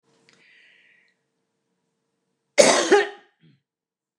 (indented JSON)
{
  "cough_length": "4.2 s",
  "cough_amplitude": 29204,
  "cough_signal_mean_std_ratio": 0.25,
  "survey_phase": "beta (2021-08-13 to 2022-03-07)",
  "age": "45-64",
  "gender": "Female",
  "wearing_mask": "No",
  "symptom_none": true,
  "smoker_status": "Never smoked",
  "respiratory_condition_asthma": true,
  "respiratory_condition_other": false,
  "recruitment_source": "REACT",
  "submission_delay": "1 day",
  "covid_test_result": "Negative",
  "covid_test_method": "RT-qPCR",
  "influenza_a_test_result": "Negative",
  "influenza_b_test_result": "Negative"
}